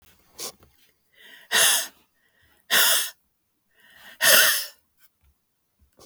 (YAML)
exhalation_length: 6.1 s
exhalation_amplitude: 25838
exhalation_signal_mean_std_ratio: 0.36
survey_phase: beta (2021-08-13 to 2022-03-07)
age: 65+
gender: Female
wearing_mask: 'No'
symptom_runny_or_blocked_nose: true
symptom_onset: 3 days
smoker_status: Never smoked
respiratory_condition_asthma: false
respiratory_condition_other: false
recruitment_source: Test and Trace
submission_delay: 1 day
covid_test_result: Positive
covid_test_method: RT-qPCR
covid_ct_value: 26.8
covid_ct_gene: ORF1ab gene